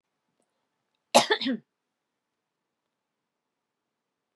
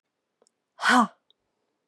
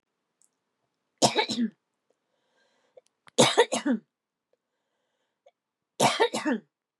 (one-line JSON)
{"cough_length": "4.4 s", "cough_amplitude": 24502, "cough_signal_mean_std_ratio": 0.19, "exhalation_length": "1.9 s", "exhalation_amplitude": 16770, "exhalation_signal_mean_std_ratio": 0.28, "three_cough_length": "7.0 s", "three_cough_amplitude": 18662, "three_cough_signal_mean_std_ratio": 0.32, "survey_phase": "beta (2021-08-13 to 2022-03-07)", "age": "18-44", "gender": "Female", "wearing_mask": "No", "symptom_none": true, "smoker_status": "Never smoked", "respiratory_condition_asthma": false, "respiratory_condition_other": false, "recruitment_source": "REACT", "submission_delay": "9 days", "covid_test_result": "Negative", "covid_test_method": "RT-qPCR", "influenza_a_test_result": "Negative", "influenza_b_test_result": "Negative"}